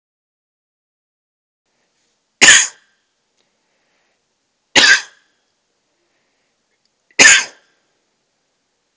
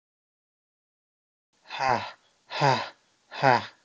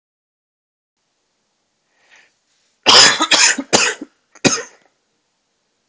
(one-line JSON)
{"three_cough_length": "9.0 s", "three_cough_amplitude": 32768, "three_cough_signal_mean_std_ratio": 0.23, "exhalation_length": "3.8 s", "exhalation_amplitude": 17457, "exhalation_signal_mean_std_ratio": 0.33, "cough_length": "5.9 s", "cough_amplitude": 32768, "cough_signal_mean_std_ratio": 0.31, "survey_phase": "alpha (2021-03-01 to 2021-08-12)", "age": "18-44", "gender": "Male", "wearing_mask": "No", "symptom_fatigue": true, "symptom_onset": "3 days", "smoker_status": "Never smoked", "respiratory_condition_asthma": false, "respiratory_condition_other": false, "recruitment_source": "Test and Trace", "submission_delay": "2 days", "covid_test_result": "Positive", "covid_test_method": "RT-qPCR"}